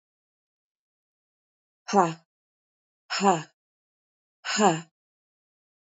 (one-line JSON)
{"exhalation_length": "5.8 s", "exhalation_amplitude": 17934, "exhalation_signal_mean_std_ratio": 0.26, "survey_phase": "beta (2021-08-13 to 2022-03-07)", "age": "45-64", "gender": "Female", "wearing_mask": "No", "symptom_cough_any": true, "symptom_runny_or_blocked_nose": true, "symptom_sore_throat": true, "symptom_diarrhoea": true, "symptom_fatigue": true, "symptom_headache": true, "symptom_other": true, "symptom_onset": "3 days", "smoker_status": "Never smoked", "respiratory_condition_asthma": false, "respiratory_condition_other": false, "recruitment_source": "Test and Trace", "submission_delay": "2 days", "covid_test_result": "Positive", "covid_test_method": "RT-qPCR", "covid_ct_value": 16.5, "covid_ct_gene": "ORF1ab gene"}